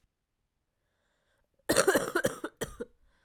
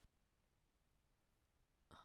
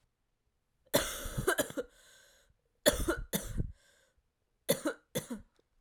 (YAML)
cough_length: 3.2 s
cough_amplitude: 16628
cough_signal_mean_std_ratio: 0.33
exhalation_length: 2.0 s
exhalation_amplitude: 130
exhalation_signal_mean_std_ratio: 0.53
three_cough_length: 5.8 s
three_cough_amplitude: 10016
three_cough_signal_mean_std_ratio: 0.39
survey_phase: beta (2021-08-13 to 2022-03-07)
age: 18-44
gender: Female
wearing_mask: 'No'
symptom_runny_or_blocked_nose: true
symptom_fatigue: true
symptom_fever_high_temperature: true
symptom_headache: true
symptom_onset: 6 days
smoker_status: Never smoked
respiratory_condition_asthma: false
respiratory_condition_other: false
recruitment_source: Test and Trace
submission_delay: 1 day
covid_test_result: Positive
covid_test_method: RT-qPCR